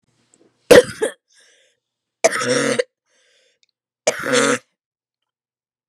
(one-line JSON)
{"three_cough_length": "5.9 s", "three_cough_amplitude": 32768, "three_cough_signal_mean_std_ratio": 0.3, "survey_phase": "beta (2021-08-13 to 2022-03-07)", "age": "18-44", "gender": "Female", "wearing_mask": "No", "symptom_cough_any": true, "symptom_runny_or_blocked_nose": true, "symptom_shortness_of_breath": true, "symptom_fatigue": true, "symptom_loss_of_taste": true, "smoker_status": "Never smoked", "respiratory_condition_asthma": true, "respiratory_condition_other": false, "recruitment_source": "Test and Trace", "submission_delay": "1 day", "covid_test_result": "Positive", "covid_test_method": "RT-qPCR", "covid_ct_value": 18.6, "covid_ct_gene": "ORF1ab gene", "covid_ct_mean": 19.1, "covid_viral_load": "550000 copies/ml", "covid_viral_load_category": "Low viral load (10K-1M copies/ml)"}